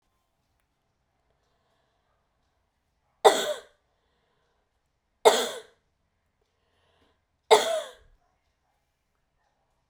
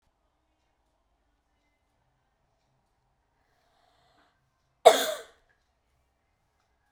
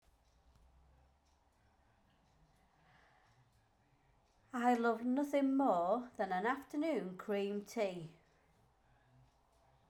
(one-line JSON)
{"three_cough_length": "9.9 s", "three_cough_amplitude": 26713, "three_cough_signal_mean_std_ratio": 0.19, "cough_length": "6.9 s", "cough_amplitude": 32046, "cough_signal_mean_std_ratio": 0.12, "exhalation_length": "9.9 s", "exhalation_amplitude": 2900, "exhalation_signal_mean_std_ratio": 0.48, "survey_phase": "beta (2021-08-13 to 2022-03-07)", "age": "45-64", "gender": "Female", "wearing_mask": "No", "symptom_cough_any": true, "symptom_runny_or_blocked_nose": true, "symptom_sore_throat": true, "symptom_headache": true, "symptom_change_to_sense_of_smell_or_taste": true, "symptom_loss_of_taste": true, "smoker_status": "Never smoked", "respiratory_condition_asthma": false, "respiratory_condition_other": false, "recruitment_source": "Test and Trace", "submission_delay": "1 day", "covid_test_result": "Positive", "covid_test_method": "RT-qPCR", "covid_ct_value": 20.2, "covid_ct_gene": "N gene"}